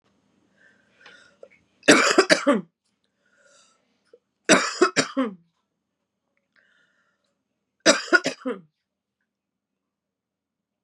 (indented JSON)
{
  "three_cough_length": "10.8 s",
  "three_cough_amplitude": 32091,
  "three_cough_signal_mean_std_ratio": 0.27,
  "survey_phase": "beta (2021-08-13 to 2022-03-07)",
  "age": "18-44",
  "gender": "Female",
  "wearing_mask": "No",
  "symptom_cough_any": true,
  "symptom_runny_or_blocked_nose": true,
  "symptom_sore_throat": true,
  "symptom_fatigue": true,
  "symptom_fever_high_temperature": true,
  "symptom_other": true,
  "symptom_onset": "2 days",
  "smoker_status": "Current smoker (11 or more cigarettes per day)",
  "respiratory_condition_asthma": false,
  "respiratory_condition_other": false,
  "recruitment_source": "Test and Trace",
  "submission_delay": "1 day",
  "covid_test_result": "Positive",
  "covid_test_method": "RT-qPCR",
  "covid_ct_value": 18.8,
  "covid_ct_gene": "ORF1ab gene",
  "covid_ct_mean": 19.2,
  "covid_viral_load": "490000 copies/ml",
  "covid_viral_load_category": "Low viral load (10K-1M copies/ml)"
}